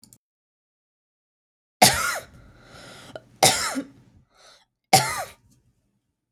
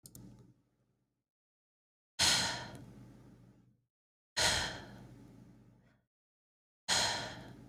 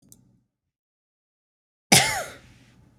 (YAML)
three_cough_length: 6.3 s
three_cough_amplitude: 31411
three_cough_signal_mean_std_ratio: 0.28
exhalation_length: 7.7 s
exhalation_amplitude: 5360
exhalation_signal_mean_std_ratio: 0.36
cough_length: 3.0 s
cough_amplitude: 32547
cough_signal_mean_std_ratio: 0.23
survey_phase: beta (2021-08-13 to 2022-03-07)
age: 18-44
gender: Female
wearing_mask: 'No'
symptom_fatigue: true
smoker_status: Never smoked
respiratory_condition_asthma: false
respiratory_condition_other: false
recruitment_source: REACT
submission_delay: 2 days
covid_test_result: Negative
covid_test_method: RT-qPCR
influenza_a_test_result: Negative
influenza_b_test_result: Negative